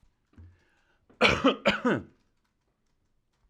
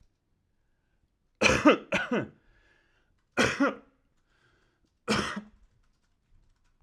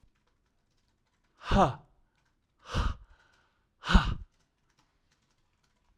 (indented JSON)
{
  "cough_length": "3.5 s",
  "cough_amplitude": 13451,
  "cough_signal_mean_std_ratio": 0.32,
  "three_cough_length": "6.8 s",
  "three_cough_amplitude": 16000,
  "three_cough_signal_mean_std_ratio": 0.31,
  "exhalation_length": "6.0 s",
  "exhalation_amplitude": 17048,
  "exhalation_signal_mean_std_ratio": 0.26,
  "survey_phase": "alpha (2021-03-01 to 2021-08-12)",
  "age": "18-44",
  "gender": "Male",
  "wearing_mask": "No",
  "symptom_none": true,
  "symptom_onset": "2 days",
  "smoker_status": "Ex-smoker",
  "respiratory_condition_asthma": false,
  "respiratory_condition_other": false,
  "recruitment_source": "REACT",
  "submission_delay": "3 days",
  "covid_test_result": "Negative",
  "covid_test_method": "RT-qPCR"
}